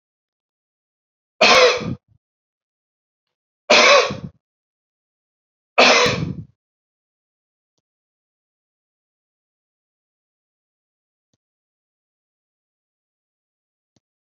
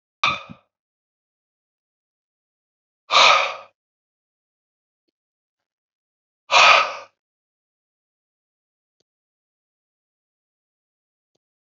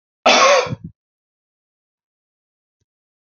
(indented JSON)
{
  "three_cough_length": "14.3 s",
  "three_cough_amplitude": 31110,
  "three_cough_signal_mean_std_ratio": 0.24,
  "exhalation_length": "11.8 s",
  "exhalation_amplitude": 29896,
  "exhalation_signal_mean_std_ratio": 0.21,
  "cough_length": "3.3 s",
  "cough_amplitude": 32768,
  "cough_signal_mean_std_ratio": 0.3,
  "survey_phase": "beta (2021-08-13 to 2022-03-07)",
  "age": "65+",
  "gender": "Male",
  "wearing_mask": "No",
  "symptom_none": true,
  "smoker_status": "Ex-smoker",
  "respiratory_condition_asthma": false,
  "respiratory_condition_other": false,
  "recruitment_source": "REACT",
  "submission_delay": "2 days",
  "covid_test_result": "Negative",
  "covid_test_method": "RT-qPCR",
  "influenza_a_test_result": "Negative",
  "influenza_b_test_result": "Negative"
}